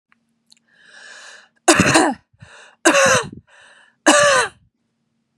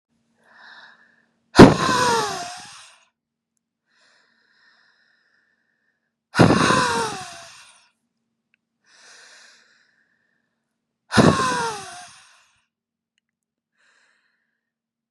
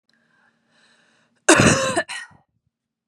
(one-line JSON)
{"three_cough_length": "5.4 s", "three_cough_amplitude": 32767, "three_cough_signal_mean_std_ratio": 0.41, "exhalation_length": "15.1 s", "exhalation_amplitude": 32768, "exhalation_signal_mean_std_ratio": 0.25, "cough_length": "3.1 s", "cough_amplitude": 32311, "cough_signal_mean_std_ratio": 0.32, "survey_phase": "beta (2021-08-13 to 2022-03-07)", "age": "18-44", "gender": "Female", "wearing_mask": "No", "symptom_none": true, "smoker_status": "Never smoked", "respiratory_condition_asthma": false, "respiratory_condition_other": false, "recruitment_source": "REACT", "submission_delay": "2 days", "covid_test_result": "Negative", "covid_test_method": "RT-qPCR", "influenza_a_test_result": "Negative", "influenza_b_test_result": "Negative"}